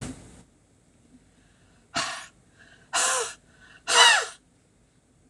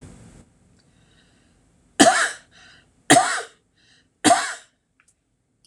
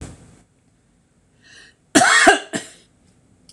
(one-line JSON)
{"exhalation_length": "5.3 s", "exhalation_amplitude": 24729, "exhalation_signal_mean_std_ratio": 0.33, "three_cough_length": "5.7 s", "three_cough_amplitude": 26028, "three_cough_signal_mean_std_ratio": 0.3, "cough_length": "3.5 s", "cough_amplitude": 26028, "cough_signal_mean_std_ratio": 0.32, "survey_phase": "beta (2021-08-13 to 2022-03-07)", "age": "65+", "gender": "Female", "wearing_mask": "No", "symptom_none": true, "smoker_status": "Ex-smoker", "respiratory_condition_asthma": false, "respiratory_condition_other": false, "recruitment_source": "REACT", "submission_delay": "2 days", "covid_test_result": "Negative", "covid_test_method": "RT-qPCR", "influenza_a_test_result": "Negative", "influenza_b_test_result": "Negative"}